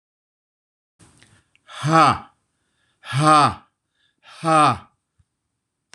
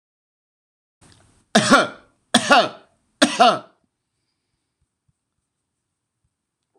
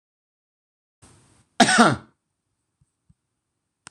exhalation_length: 5.9 s
exhalation_amplitude: 26018
exhalation_signal_mean_std_ratio: 0.34
three_cough_length: 6.8 s
three_cough_amplitude: 26028
three_cough_signal_mean_std_ratio: 0.27
cough_length: 3.9 s
cough_amplitude: 26028
cough_signal_mean_std_ratio: 0.22
survey_phase: beta (2021-08-13 to 2022-03-07)
age: 45-64
gender: Male
wearing_mask: 'No'
symptom_none: true
smoker_status: Never smoked
respiratory_condition_asthma: false
respiratory_condition_other: false
recruitment_source: REACT
submission_delay: 4 days
covid_test_result: Negative
covid_test_method: RT-qPCR
influenza_a_test_result: Negative
influenza_b_test_result: Negative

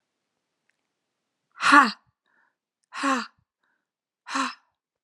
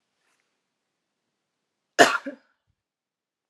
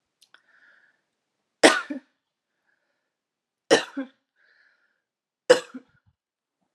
exhalation_length: 5.0 s
exhalation_amplitude: 27769
exhalation_signal_mean_std_ratio: 0.25
cough_length: 3.5 s
cough_amplitude: 32531
cough_signal_mean_std_ratio: 0.16
three_cough_length: 6.7 s
three_cough_amplitude: 32099
three_cough_signal_mean_std_ratio: 0.18
survey_phase: beta (2021-08-13 to 2022-03-07)
age: 18-44
gender: Female
wearing_mask: 'No'
symptom_none: true
smoker_status: Current smoker (e-cigarettes or vapes only)
respiratory_condition_asthma: false
respiratory_condition_other: false
recruitment_source: REACT
submission_delay: 6 days
covid_test_result: Negative
covid_test_method: RT-qPCR
influenza_a_test_result: Negative
influenza_b_test_result: Negative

